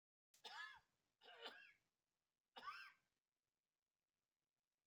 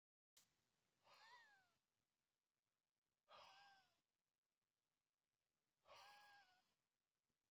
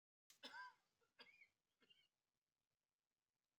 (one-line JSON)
{"three_cough_length": "4.9 s", "three_cough_amplitude": 299, "three_cough_signal_mean_std_ratio": 0.38, "exhalation_length": "7.5 s", "exhalation_amplitude": 61, "exhalation_signal_mean_std_ratio": 0.44, "cough_length": "3.6 s", "cough_amplitude": 188, "cough_signal_mean_std_ratio": 0.32, "survey_phase": "beta (2021-08-13 to 2022-03-07)", "age": "65+", "gender": "Male", "wearing_mask": "No", "symptom_none": true, "smoker_status": "Ex-smoker", "respiratory_condition_asthma": false, "respiratory_condition_other": false, "recruitment_source": "REACT", "submission_delay": "0 days", "covid_test_result": "Negative", "covid_test_method": "RT-qPCR"}